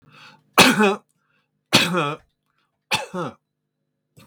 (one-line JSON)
{"three_cough_length": "4.3 s", "three_cough_amplitude": 32768, "three_cough_signal_mean_std_ratio": 0.36, "survey_phase": "beta (2021-08-13 to 2022-03-07)", "age": "65+", "gender": "Male", "wearing_mask": "No", "symptom_none": true, "smoker_status": "Never smoked", "respiratory_condition_asthma": false, "respiratory_condition_other": false, "recruitment_source": "REACT", "submission_delay": "2 days", "covid_test_result": "Negative", "covid_test_method": "RT-qPCR", "influenza_a_test_result": "Negative", "influenza_b_test_result": "Negative"}